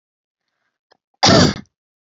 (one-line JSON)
{"cough_length": "2.0 s", "cough_amplitude": 31847, "cough_signal_mean_std_ratio": 0.32, "survey_phase": "beta (2021-08-13 to 2022-03-07)", "age": "18-44", "gender": "Female", "wearing_mask": "No", "symptom_none": true, "smoker_status": "Never smoked", "respiratory_condition_asthma": true, "respiratory_condition_other": false, "recruitment_source": "Test and Trace", "submission_delay": "-1 day", "covid_test_result": "Negative", "covid_test_method": "LFT"}